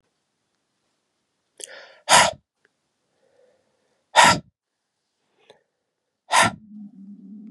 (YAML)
exhalation_length: 7.5 s
exhalation_amplitude: 31200
exhalation_signal_mean_std_ratio: 0.24
survey_phase: beta (2021-08-13 to 2022-03-07)
age: 18-44
gender: Male
wearing_mask: 'No'
symptom_cough_any: true
symptom_runny_or_blocked_nose: true
symptom_fatigue: true
symptom_change_to_sense_of_smell_or_taste: true
symptom_loss_of_taste: true
symptom_onset: 3 days
smoker_status: Never smoked
respiratory_condition_asthma: true
respiratory_condition_other: false
recruitment_source: Test and Trace
submission_delay: 2 days
covid_test_result: Positive
covid_test_method: RT-qPCR
covid_ct_value: 17.3
covid_ct_gene: N gene
covid_ct_mean: 17.4
covid_viral_load: 1900000 copies/ml
covid_viral_load_category: High viral load (>1M copies/ml)